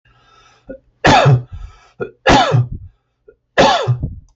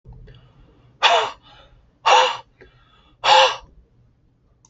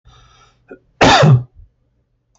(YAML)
three_cough_length: 4.4 s
three_cough_amplitude: 29380
three_cough_signal_mean_std_ratio: 0.49
exhalation_length: 4.7 s
exhalation_amplitude: 27535
exhalation_signal_mean_std_ratio: 0.36
cough_length: 2.4 s
cough_amplitude: 29348
cough_signal_mean_std_ratio: 0.37
survey_phase: beta (2021-08-13 to 2022-03-07)
age: 45-64
gender: Male
wearing_mask: 'No'
symptom_none: true
smoker_status: Never smoked
respiratory_condition_asthma: false
respiratory_condition_other: false
recruitment_source: REACT
submission_delay: 1 day
covid_test_result: Negative
covid_test_method: RT-qPCR